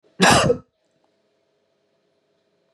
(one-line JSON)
{"cough_length": "2.7 s", "cough_amplitude": 29039, "cough_signal_mean_std_ratio": 0.29, "survey_phase": "beta (2021-08-13 to 2022-03-07)", "age": "45-64", "gender": "Male", "wearing_mask": "No", "symptom_none": true, "smoker_status": "Never smoked", "respiratory_condition_asthma": false, "respiratory_condition_other": false, "recruitment_source": "REACT", "submission_delay": "2 days", "covid_test_result": "Negative", "covid_test_method": "RT-qPCR", "influenza_a_test_result": "Unknown/Void", "influenza_b_test_result": "Unknown/Void"}